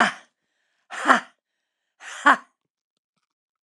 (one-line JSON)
{"exhalation_length": "3.6 s", "exhalation_amplitude": 29204, "exhalation_signal_mean_std_ratio": 0.25, "survey_phase": "alpha (2021-03-01 to 2021-08-12)", "age": "45-64", "gender": "Female", "wearing_mask": "No", "symptom_none": true, "smoker_status": "Never smoked", "respiratory_condition_asthma": false, "respiratory_condition_other": false, "recruitment_source": "REACT", "submission_delay": "2 days", "covid_test_result": "Negative", "covid_test_method": "RT-qPCR"}